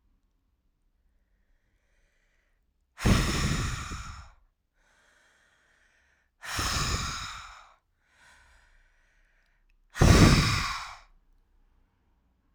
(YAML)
exhalation_length: 12.5 s
exhalation_amplitude: 16599
exhalation_signal_mean_std_ratio: 0.32
survey_phase: alpha (2021-03-01 to 2021-08-12)
age: 18-44
gender: Female
wearing_mask: 'No'
symptom_cough_any: true
symptom_shortness_of_breath: true
symptom_fatigue: true
symptom_fever_high_temperature: true
symptom_headache: true
symptom_change_to_sense_of_smell_or_taste: true
symptom_loss_of_taste: true
symptom_onset: 8 days
smoker_status: Ex-smoker
respiratory_condition_asthma: false
respiratory_condition_other: false
recruitment_source: Test and Trace
submission_delay: 1 day
covid_test_result: Positive
covid_test_method: ePCR